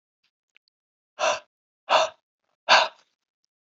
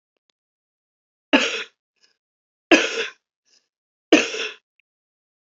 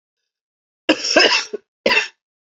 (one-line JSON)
{"exhalation_length": "3.8 s", "exhalation_amplitude": 26081, "exhalation_signal_mean_std_ratio": 0.28, "three_cough_length": "5.5 s", "three_cough_amplitude": 29027, "three_cough_signal_mean_std_ratio": 0.26, "cough_length": "2.6 s", "cough_amplitude": 32767, "cough_signal_mean_std_ratio": 0.4, "survey_phase": "beta (2021-08-13 to 2022-03-07)", "age": "45-64", "gender": "Female", "wearing_mask": "No", "symptom_cough_any": true, "symptom_runny_or_blocked_nose": true, "symptom_sore_throat": true, "symptom_abdominal_pain": true, "symptom_fatigue": true, "symptom_headache": true, "symptom_onset": "3 days", "smoker_status": "Ex-smoker", "respiratory_condition_asthma": false, "respiratory_condition_other": false, "recruitment_source": "Test and Trace", "submission_delay": "2 days", "covid_test_result": "Positive", "covid_test_method": "RT-qPCR", "covid_ct_value": 21.3, "covid_ct_gene": "ORF1ab gene", "covid_ct_mean": 21.8, "covid_viral_load": "69000 copies/ml", "covid_viral_load_category": "Low viral load (10K-1M copies/ml)"}